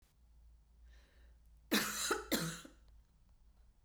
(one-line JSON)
{"cough_length": "3.8 s", "cough_amplitude": 3342, "cough_signal_mean_std_ratio": 0.41, "survey_phase": "beta (2021-08-13 to 2022-03-07)", "age": "45-64", "gender": "Female", "wearing_mask": "No", "symptom_cough_any": true, "symptom_runny_or_blocked_nose": true, "symptom_sore_throat": true, "symptom_fatigue": true, "symptom_headache": true, "smoker_status": "Never smoked", "respiratory_condition_asthma": true, "respiratory_condition_other": false, "recruitment_source": "Test and Trace", "submission_delay": "2 days", "covid_test_result": "Positive", "covid_test_method": "ePCR"}